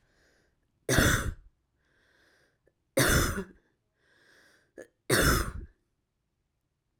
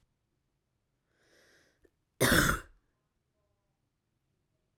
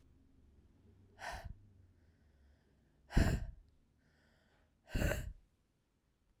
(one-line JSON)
{"three_cough_length": "7.0 s", "three_cough_amplitude": 12546, "three_cough_signal_mean_std_ratio": 0.35, "cough_length": "4.8 s", "cough_amplitude": 10375, "cough_signal_mean_std_ratio": 0.23, "exhalation_length": "6.4 s", "exhalation_amplitude": 4082, "exhalation_signal_mean_std_ratio": 0.29, "survey_phase": "beta (2021-08-13 to 2022-03-07)", "age": "45-64", "gender": "Female", "wearing_mask": "No", "symptom_cough_any": true, "symptom_runny_or_blocked_nose": true, "symptom_diarrhoea": true, "symptom_fever_high_temperature": true, "symptom_headache": true, "symptom_change_to_sense_of_smell_or_taste": true, "symptom_loss_of_taste": true, "symptom_onset": "2 days", "smoker_status": "Current smoker (1 to 10 cigarettes per day)", "respiratory_condition_asthma": false, "respiratory_condition_other": false, "recruitment_source": "Test and Trace", "submission_delay": "2 days", "covid_test_result": "Positive", "covid_test_method": "RT-qPCR", "covid_ct_value": 19.8, "covid_ct_gene": "ORF1ab gene", "covid_ct_mean": 20.3, "covid_viral_load": "220000 copies/ml", "covid_viral_load_category": "Low viral load (10K-1M copies/ml)"}